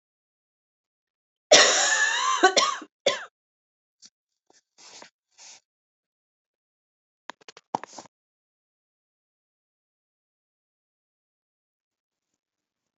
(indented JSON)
{
  "cough_length": "13.0 s",
  "cough_amplitude": 32767,
  "cough_signal_mean_std_ratio": 0.23,
  "survey_phase": "alpha (2021-03-01 to 2021-08-12)",
  "age": "45-64",
  "gender": "Female",
  "wearing_mask": "No",
  "symptom_cough_any": true,
  "smoker_status": "Never smoked",
  "respiratory_condition_asthma": false,
  "respiratory_condition_other": false,
  "recruitment_source": "Test and Trace",
  "submission_delay": "2 days",
  "covid_test_result": "Positive",
  "covid_test_method": "RT-qPCR",
  "covid_ct_value": 19.9,
  "covid_ct_gene": "ORF1ab gene",
  "covid_ct_mean": 20.8,
  "covid_viral_load": "150000 copies/ml",
  "covid_viral_load_category": "Low viral load (10K-1M copies/ml)"
}